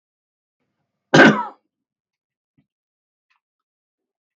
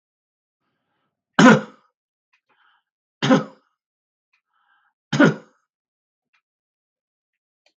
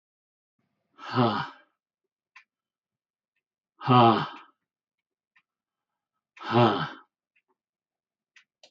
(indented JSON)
{
  "cough_length": "4.4 s",
  "cough_amplitude": 32158,
  "cough_signal_mean_std_ratio": 0.19,
  "three_cough_length": "7.8 s",
  "three_cough_amplitude": 32400,
  "three_cough_signal_mean_std_ratio": 0.21,
  "exhalation_length": "8.7 s",
  "exhalation_amplitude": 18612,
  "exhalation_signal_mean_std_ratio": 0.26,
  "survey_phase": "beta (2021-08-13 to 2022-03-07)",
  "age": "65+",
  "gender": "Male",
  "wearing_mask": "No",
  "symptom_none": true,
  "smoker_status": "Never smoked",
  "respiratory_condition_asthma": false,
  "respiratory_condition_other": false,
  "recruitment_source": "REACT",
  "submission_delay": "1 day",
  "covid_test_result": "Negative",
  "covid_test_method": "RT-qPCR",
  "influenza_a_test_result": "Negative",
  "influenza_b_test_result": "Negative"
}